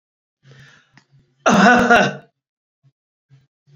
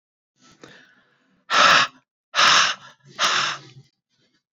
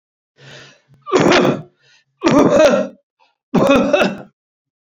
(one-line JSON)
{"cough_length": "3.8 s", "cough_amplitude": 28506, "cough_signal_mean_std_ratio": 0.35, "exhalation_length": "4.5 s", "exhalation_amplitude": 25952, "exhalation_signal_mean_std_ratio": 0.4, "three_cough_length": "4.9 s", "three_cough_amplitude": 29470, "three_cough_signal_mean_std_ratio": 0.52, "survey_phase": "beta (2021-08-13 to 2022-03-07)", "age": "45-64", "gender": "Male", "wearing_mask": "No", "symptom_cough_any": true, "symptom_runny_or_blocked_nose": true, "symptom_sore_throat": true, "symptom_fatigue": true, "symptom_change_to_sense_of_smell_or_taste": true, "symptom_loss_of_taste": true, "symptom_onset": "3 days", "smoker_status": "Ex-smoker", "respiratory_condition_asthma": false, "respiratory_condition_other": false, "recruitment_source": "Test and Trace", "submission_delay": "2 days", "covid_test_result": "Positive", "covid_test_method": "RT-qPCR", "covid_ct_value": 14.6, "covid_ct_gene": "ORF1ab gene", "covid_ct_mean": 14.9, "covid_viral_load": "13000000 copies/ml", "covid_viral_load_category": "High viral load (>1M copies/ml)"}